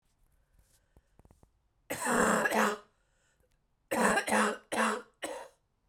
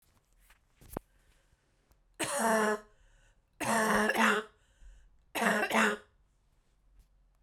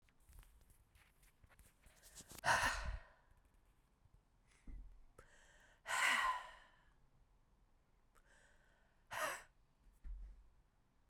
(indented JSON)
{
  "cough_length": "5.9 s",
  "cough_amplitude": 8771,
  "cough_signal_mean_std_ratio": 0.47,
  "three_cough_length": "7.4 s",
  "three_cough_amplitude": 8565,
  "three_cough_signal_mean_std_ratio": 0.44,
  "exhalation_length": "11.1 s",
  "exhalation_amplitude": 2375,
  "exhalation_signal_mean_std_ratio": 0.35,
  "survey_phase": "beta (2021-08-13 to 2022-03-07)",
  "age": "18-44",
  "gender": "Female",
  "wearing_mask": "No",
  "symptom_cough_any": true,
  "symptom_new_continuous_cough": true,
  "symptom_runny_or_blocked_nose": true,
  "symptom_sore_throat": true,
  "symptom_fatigue": true,
  "symptom_fever_high_temperature": true,
  "symptom_headache": true,
  "symptom_change_to_sense_of_smell_or_taste": true,
  "symptom_onset": "3 days",
  "smoker_status": "Never smoked",
  "respiratory_condition_asthma": false,
  "respiratory_condition_other": false,
  "recruitment_source": "Test and Trace",
  "submission_delay": "2 days",
  "covid_test_result": "Positive",
  "covid_test_method": "RT-qPCR",
  "covid_ct_value": 15.5,
  "covid_ct_gene": "ORF1ab gene",
  "covid_ct_mean": 16.0,
  "covid_viral_load": "5900000 copies/ml",
  "covid_viral_load_category": "High viral load (>1M copies/ml)"
}